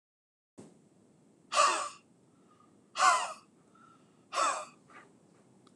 {"exhalation_length": "5.8 s", "exhalation_amplitude": 8150, "exhalation_signal_mean_std_ratio": 0.34, "survey_phase": "beta (2021-08-13 to 2022-03-07)", "age": "45-64", "gender": "Male", "wearing_mask": "No", "symptom_sore_throat": true, "symptom_onset": "2 days", "smoker_status": "Ex-smoker", "respiratory_condition_asthma": false, "respiratory_condition_other": false, "recruitment_source": "REACT", "submission_delay": "1 day", "covid_test_result": "Negative", "covid_test_method": "RT-qPCR"}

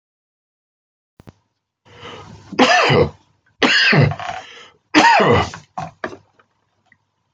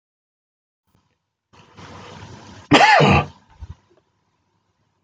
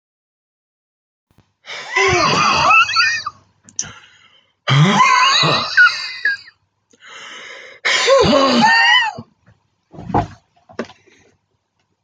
{"three_cough_length": "7.3 s", "three_cough_amplitude": 30751, "three_cough_signal_mean_std_ratio": 0.42, "cough_length": "5.0 s", "cough_amplitude": 28041, "cough_signal_mean_std_ratio": 0.29, "exhalation_length": "12.0 s", "exhalation_amplitude": 27304, "exhalation_signal_mean_std_ratio": 0.54, "survey_phase": "beta (2021-08-13 to 2022-03-07)", "age": "65+", "gender": "Male", "wearing_mask": "No", "symptom_none": true, "smoker_status": "Never smoked", "respiratory_condition_asthma": false, "respiratory_condition_other": false, "recruitment_source": "REACT", "submission_delay": "2 days", "covid_test_result": "Negative", "covid_test_method": "RT-qPCR"}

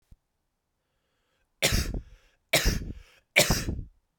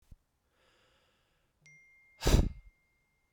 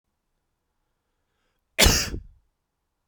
{"three_cough_length": "4.2 s", "three_cough_amplitude": 19057, "three_cough_signal_mean_std_ratio": 0.39, "exhalation_length": "3.3 s", "exhalation_amplitude": 9393, "exhalation_signal_mean_std_ratio": 0.22, "cough_length": "3.1 s", "cough_amplitude": 23394, "cough_signal_mean_std_ratio": 0.24, "survey_phase": "beta (2021-08-13 to 2022-03-07)", "age": "18-44", "gender": "Male", "wearing_mask": "No", "symptom_cough_any": true, "symptom_runny_or_blocked_nose": true, "symptom_fatigue": true, "symptom_headache": true, "symptom_change_to_sense_of_smell_or_taste": true, "smoker_status": "Ex-smoker", "respiratory_condition_asthma": false, "respiratory_condition_other": false, "recruitment_source": "Test and Trace", "submission_delay": "2 days", "covid_test_result": "Positive", "covid_test_method": "RT-qPCR", "covid_ct_value": 13.3, "covid_ct_gene": "ORF1ab gene"}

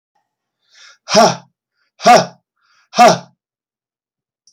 {"exhalation_length": "4.5 s", "exhalation_amplitude": 32768, "exhalation_signal_mean_std_ratio": 0.31, "survey_phase": "alpha (2021-03-01 to 2021-08-12)", "age": "65+", "gender": "Male", "wearing_mask": "No", "symptom_cough_any": true, "symptom_onset": "12 days", "smoker_status": "Never smoked", "respiratory_condition_asthma": false, "respiratory_condition_other": false, "recruitment_source": "REACT", "submission_delay": "1 day", "covid_test_result": "Negative", "covid_test_method": "RT-qPCR"}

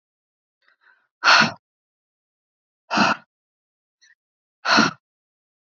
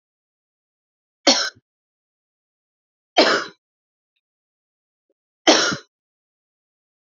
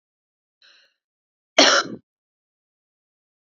{"exhalation_length": "5.7 s", "exhalation_amplitude": 29317, "exhalation_signal_mean_std_ratio": 0.28, "three_cough_length": "7.2 s", "three_cough_amplitude": 31128, "three_cough_signal_mean_std_ratio": 0.24, "cough_length": "3.6 s", "cough_amplitude": 30178, "cough_signal_mean_std_ratio": 0.21, "survey_phase": "beta (2021-08-13 to 2022-03-07)", "age": "18-44", "gender": "Female", "wearing_mask": "No", "symptom_cough_any": true, "symptom_runny_or_blocked_nose": true, "symptom_fatigue": true, "symptom_headache": true, "symptom_other": true, "symptom_onset": "2 days", "smoker_status": "Current smoker (e-cigarettes or vapes only)", "respiratory_condition_asthma": false, "respiratory_condition_other": false, "recruitment_source": "Test and Trace", "submission_delay": "1 day", "covid_test_result": "Positive", "covid_test_method": "RT-qPCR", "covid_ct_value": 22.4, "covid_ct_gene": "ORF1ab gene"}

